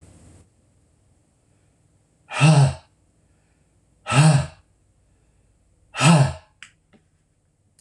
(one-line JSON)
{"exhalation_length": "7.8 s", "exhalation_amplitude": 24918, "exhalation_signal_mean_std_ratio": 0.31, "survey_phase": "beta (2021-08-13 to 2022-03-07)", "age": "65+", "gender": "Male", "wearing_mask": "No", "symptom_none": true, "smoker_status": "Ex-smoker", "respiratory_condition_asthma": false, "respiratory_condition_other": false, "recruitment_source": "REACT", "submission_delay": "2 days", "covid_test_result": "Negative", "covid_test_method": "RT-qPCR"}